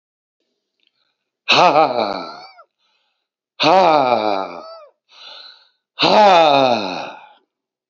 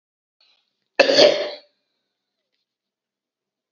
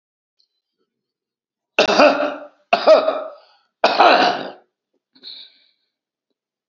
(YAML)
exhalation_length: 7.9 s
exhalation_amplitude: 32767
exhalation_signal_mean_std_ratio: 0.44
cough_length: 3.7 s
cough_amplitude: 32768
cough_signal_mean_std_ratio: 0.26
three_cough_length: 6.7 s
three_cough_amplitude: 32768
three_cough_signal_mean_std_ratio: 0.37
survey_phase: beta (2021-08-13 to 2022-03-07)
age: 45-64
gender: Male
wearing_mask: 'No'
symptom_runny_or_blocked_nose: true
symptom_shortness_of_breath: true
smoker_status: Current smoker (1 to 10 cigarettes per day)
respiratory_condition_asthma: false
respiratory_condition_other: true
recruitment_source: REACT
submission_delay: 0 days
covid_test_result: Negative
covid_test_method: RT-qPCR
influenza_a_test_result: Unknown/Void
influenza_b_test_result: Unknown/Void